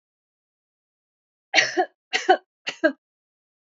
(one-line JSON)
{"three_cough_length": "3.7 s", "three_cough_amplitude": 25154, "three_cough_signal_mean_std_ratio": 0.28, "survey_phase": "beta (2021-08-13 to 2022-03-07)", "age": "18-44", "gender": "Female", "wearing_mask": "No", "symptom_none": true, "symptom_onset": "3 days", "smoker_status": "Never smoked", "respiratory_condition_asthma": false, "respiratory_condition_other": false, "recruitment_source": "REACT", "submission_delay": "1 day", "covid_test_result": "Negative", "covid_test_method": "RT-qPCR", "influenza_a_test_result": "Unknown/Void", "influenza_b_test_result": "Unknown/Void"}